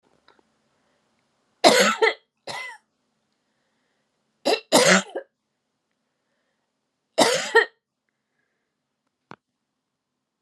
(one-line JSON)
{"three_cough_length": "10.4 s", "three_cough_amplitude": 32080, "three_cough_signal_mean_std_ratio": 0.27, "survey_phase": "beta (2021-08-13 to 2022-03-07)", "age": "45-64", "gender": "Female", "wearing_mask": "No", "symptom_none": true, "smoker_status": "Never smoked", "respiratory_condition_asthma": false, "respiratory_condition_other": false, "recruitment_source": "REACT", "submission_delay": "3 days", "covid_test_result": "Negative", "covid_test_method": "RT-qPCR", "influenza_a_test_result": "Unknown/Void", "influenza_b_test_result": "Unknown/Void"}